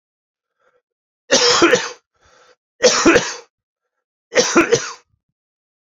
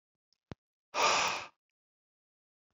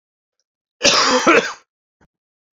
{"three_cough_length": "6.0 s", "three_cough_amplitude": 32767, "three_cough_signal_mean_std_ratio": 0.39, "exhalation_length": "2.7 s", "exhalation_amplitude": 5918, "exhalation_signal_mean_std_ratio": 0.33, "cough_length": "2.6 s", "cough_amplitude": 30397, "cough_signal_mean_std_ratio": 0.4, "survey_phase": "beta (2021-08-13 to 2022-03-07)", "age": "45-64", "gender": "Male", "wearing_mask": "No", "symptom_cough_any": true, "symptom_new_continuous_cough": true, "symptom_sore_throat": true, "symptom_fatigue": true, "symptom_fever_high_temperature": true, "symptom_change_to_sense_of_smell_or_taste": true, "symptom_onset": "6 days", "smoker_status": "Never smoked", "respiratory_condition_asthma": false, "respiratory_condition_other": false, "recruitment_source": "Test and Trace", "submission_delay": "2 days", "covid_test_result": "Positive", "covid_test_method": "RT-qPCR"}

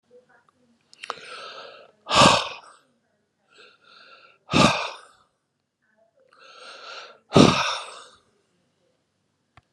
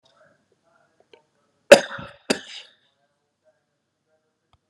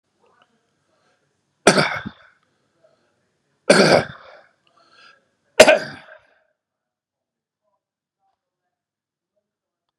{"exhalation_length": "9.7 s", "exhalation_amplitude": 32767, "exhalation_signal_mean_std_ratio": 0.27, "cough_length": "4.7 s", "cough_amplitude": 32768, "cough_signal_mean_std_ratio": 0.13, "three_cough_length": "10.0 s", "three_cough_amplitude": 32768, "three_cough_signal_mean_std_ratio": 0.21, "survey_phase": "beta (2021-08-13 to 2022-03-07)", "age": "65+", "gender": "Male", "wearing_mask": "No", "symptom_none": true, "smoker_status": "Ex-smoker", "respiratory_condition_asthma": false, "respiratory_condition_other": false, "recruitment_source": "REACT", "submission_delay": "4 days", "covid_test_result": "Negative", "covid_test_method": "RT-qPCR", "influenza_a_test_result": "Negative", "influenza_b_test_result": "Negative"}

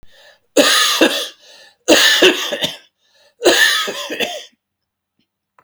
{"three_cough_length": "5.6 s", "three_cough_amplitude": 32768, "three_cough_signal_mean_std_ratio": 0.5, "survey_phase": "beta (2021-08-13 to 2022-03-07)", "age": "65+", "gender": "Male", "wearing_mask": "No", "symptom_cough_any": true, "symptom_new_continuous_cough": true, "symptom_runny_or_blocked_nose": true, "symptom_onset": "4 days", "smoker_status": "Never smoked", "respiratory_condition_asthma": false, "respiratory_condition_other": false, "recruitment_source": "Test and Trace", "submission_delay": "1 day", "covid_test_result": "Negative", "covid_test_method": "ePCR"}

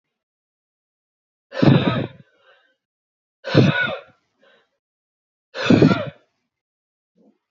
{"exhalation_length": "7.5 s", "exhalation_amplitude": 30970, "exhalation_signal_mean_std_ratio": 0.32, "survey_phase": "beta (2021-08-13 to 2022-03-07)", "age": "45-64", "gender": "Male", "wearing_mask": "No", "symptom_none": true, "smoker_status": "Ex-smoker", "respiratory_condition_asthma": false, "respiratory_condition_other": false, "recruitment_source": "REACT", "submission_delay": "5 days", "covid_test_result": "Negative", "covid_test_method": "RT-qPCR"}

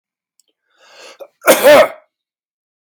{"cough_length": "3.0 s", "cough_amplitude": 32768, "cough_signal_mean_std_ratio": 0.32, "survey_phase": "beta (2021-08-13 to 2022-03-07)", "age": "45-64", "gender": "Male", "wearing_mask": "No", "symptom_abdominal_pain": true, "symptom_diarrhoea": true, "smoker_status": "Never smoked", "respiratory_condition_asthma": false, "respiratory_condition_other": false, "recruitment_source": "REACT", "submission_delay": "3 days", "covid_test_result": "Negative", "covid_test_method": "RT-qPCR"}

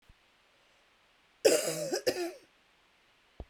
{"cough_length": "3.5 s", "cough_amplitude": 10607, "cough_signal_mean_std_ratio": 0.34, "survey_phase": "beta (2021-08-13 to 2022-03-07)", "age": "45-64", "gender": "Female", "wearing_mask": "No", "symptom_runny_or_blocked_nose": true, "symptom_abdominal_pain": true, "symptom_diarrhoea": true, "symptom_fatigue": true, "symptom_onset": "12 days", "smoker_status": "Ex-smoker", "respiratory_condition_asthma": true, "respiratory_condition_other": false, "recruitment_source": "REACT", "submission_delay": "1 day", "covid_test_result": "Negative", "covid_test_method": "RT-qPCR", "influenza_a_test_result": "Negative", "influenza_b_test_result": "Negative"}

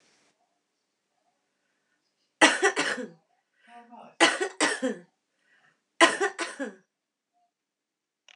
{"three_cough_length": "8.4 s", "three_cough_amplitude": 24522, "three_cough_signal_mean_std_ratio": 0.29, "survey_phase": "beta (2021-08-13 to 2022-03-07)", "age": "45-64", "gender": "Female", "wearing_mask": "No", "symptom_none": true, "smoker_status": "Current smoker (1 to 10 cigarettes per day)", "respiratory_condition_asthma": false, "respiratory_condition_other": false, "recruitment_source": "REACT", "submission_delay": "2 days", "covid_test_result": "Negative", "covid_test_method": "RT-qPCR", "influenza_a_test_result": "Negative", "influenza_b_test_result": "Negative"}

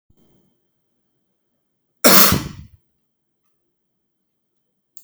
{"cough_length": "5.0 s", "cough_amplitude": 32768, "cough_signal_mean_std_ratio": 0.21, "survey_phase": "beta (2021-08-13 to 2022-03-07)", "age": "45-64", "gender": "Male", "wearing_mask": "No", "symptom_none": true, "smoker_status": "Ex-smoker", "respiratory_condition_asthma": false, "respiratory_condition_other": false, "recruitment_source": "Test and Trace", "submission_delay": "1 day", "covid_test_result": "Negative", "covid_test_method": "RT-qPCR"}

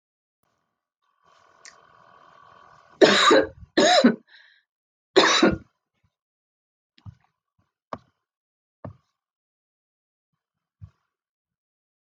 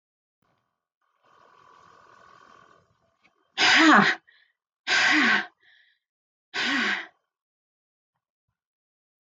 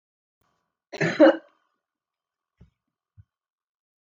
{"three_cough_length": "12.0 s", "three_cough_amplitude": 31249, "three_cough_signal_mean_std_ratio": 0.26, "exhalation_length": "9.3 s", "exhalation_amplitude": 17801, "exhalation_signal_mean_std_ratio": 0.33, "cough_length": "4.0 s", "cough_amplitude": 21708, "cough_signal_mean_std_ratio": 0.2, "survey_phase": "beta (2021-08-13 to 2022-03-07)", "age": "65+", "gender": "Female", "wearing_mask": "No", "symptom_none": true, "smoker_status": "Never smoked", "respiratory_condition_asthma": false, "respiratory_condition_other": false, "recruitment_source": "REACT", "submission_delay": "2 days", "covid_test_result": "Negative", "covid_test_method": "RT-qPCR", "influenza_a_test_result": "Negative", "influenza_b_test_result": "Negative"}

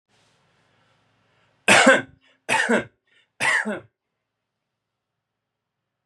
{"three_cough_length": "6.1 s", "three_cough_amplitude": 31226, "three_cough_signal_mean_std_ratio": 0.3, "survey_phase": "beta (2021-08-13 to 2022-03-07)", "age": "18-44", "gender": "Male", "wearing_mask": "No", "symptom_none": true, "smoker_status": "Never smoked", "respiratory_condition_asthma": false, "respiratory_condition_other": false, "recruitment_source": "REACT", "submission_delay": "1 day", "covid_test_result": "Negative", "covid_test_method": "RT-qPCR", "influenza_a_test_result": "Negative", "influenza_b_test_result": "Negative"}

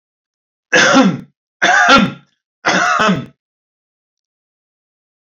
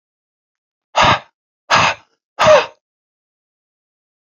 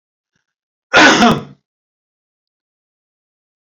{"three_cough_length": "5.2 s", "three_cough_amplitude": 30094, "three_cough_signal_mean_std_ratio": 0.45, "exhalation_length": "4.3 s", "exhalation_amplitude": 32755, "exhalation_signal_mean_std_ratio": 0.33, "cough_length": "3.8 s", "cough_amplitude": 32767, "cough_signal_mean_std_ratio": 0.29, "survey_phase": "alpha (2021-03-01 to 2021-08-12)", "age": "65+", "gender": "Male", "wearing_mask": "No", "symptom_none": true, "smoker_status": "Ex-smoker", "respiratory_condition_asthma": false, "respiratory_condition_other": false, "recruitment_source": "REACT", "submission_delay": "1 day", "covid_test_result": "Negative", "covid_test_method": "RT-qPCR"}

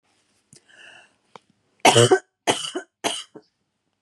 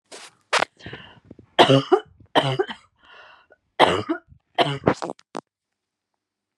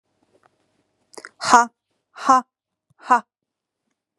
{"cough_length": "4.0 s", "cough_amplitude": 31957, "cough_signal_mean_std_ratio": 0.29, "three_cough_length": "6.6 s", "three_cough_amplitude": 31906, "three_cough_signal_mean_std_ratio": 0.33, "exhalation_length": "4.2 s", "exhalation_amplitude": 32767, "exhalation_signal_mean_std_ratio": 0.24, "survey_phase": "beta (2021-08-13 to 2022-03-07)", "age": "18-44", "gender": "Female", "wearing_mask": "No", "symptom_none": true, "smoker_status": "Never smoked", "respiratory_condition_asthma": false, "respiratory_condition_other": false, "recruitment_source": "REACT", "submission_delay": "1 day", "covid_test_result": "Negative", "covid_test_method": "RT-qPCR"}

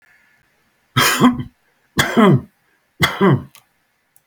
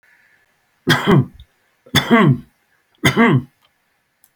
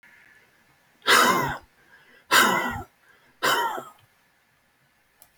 {"cough_length": "4.3 s", "cough_amplitude": 31145, "cough_signal_mean_std_ratio": 0.42, "three_cough_length": "4.4 s", "three_cough_amplitude": 31774, "three_cough_signal_mean_std_ratio": 0.42, "exhalation_length": "5.4 s", "exhalation_amplitude": 20583, "exhalation_signal_mean_std_ratio": 0.39, "survey_phase": "beta (2021-08-13 to 2022-03-07)", "age": "65+", "gender": "Male", "wearing_mask": "No", "symptom_none": true, "smoker_status": "Never smoked", "respiratory_condition_asthma": false, "respiratory_condition_other": false, "recruitment_source": "REACT", "submission_delay": "8 days", "covid_test_result": "Negative", "covid_test_method": "RT-qPCR"}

